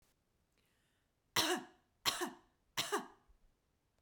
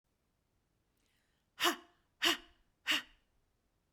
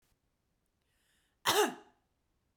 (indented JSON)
{
  "three_cough_length": "4.0 s",
  "three_cough_amplitude": 4432,
  "three_cough_signal_mean_std_ratio": 0.33,
  "exhalation_length": "3.9 s",
  "exhalation_amplitude": 5433,
  "exhalation_signal_mean_std_ratio": 0.27,
  "cough_length": "2.6 s",
  "cough_amplitude": 5666,
  "cough_signal_mean_std_ratio": 0.25,
  "survey_phase": "beta (2021-08-13 to 2022-03-07)",
  "age": "18-44",
  "gender": "Female",
  "wearing_mask": "No",
  "symptom_none": true,
  "smoker_status": "Never smoked",
  "respiratory_condition_asthma": true,
  "respiratory_condition_other": false,
  "recruitment_source": "REACT",
  "submission_delay": "2 days",
  "covid_test_result": "Negative",
  "covid_test_method": "RT-qPCR",
  "influenza_a_test_result": "Negative",
  "influenza_b_test_result": "Negative"
}